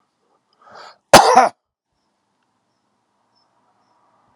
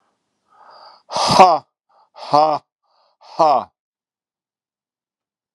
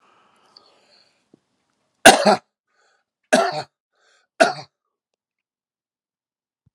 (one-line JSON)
{"cough_length": "4.4 s", "cough_amplitude": 32768, "cough_signal_mean_std_ratio": 0.22, "exhalation_length": "5.5 s", "exhalation_amplitude": 32768, "exhalation_signal_mean_std_ratio": 0.32, "three_cough_length": "6.7 s", "three_cough_amplitude": 32768, "three_cough_signal_mean_std_ratio": 0.21, "survey_phase": "beta (2021-08-13 to 2022-03-07)", "age": "65+", "gender": "Male", "wearing_mask": "Yes", "symptom_none": true, "symptom_onset": "4 days", "smoker_status": "Never smoked", "respiratory_condition_asthma": false, "respiratory_condition_other": false, "recruitment_source": "Test and Trace", "submission_delay": "1 day", "covid_test_result": "Positive", "covid_test_method": "ePCR"}